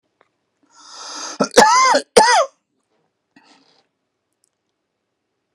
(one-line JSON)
{"cough_length": "5.5 s", "cough_amplitude": 32768, "cough_signal_mean_std_ratio": 0.33, "survey_phase": "beta (2021-08-13 to 2022-03-07)", "age": "65+", "gender": "Male", "wearing_mask": "No", "symptom_cough_any": true, "symptom_sore_throat": true, "symptom_fatigue": true, "symptom_onset": "12 days", "smoker_status": "Never smoked", "respiratory_condition_asthma": false, "respiratory_condition_other": false, "recruitment_source": "REACT", "submission_delay": "5 days", "covid_test_result": "Negative", "covid_test_method": "RT-qPCR"}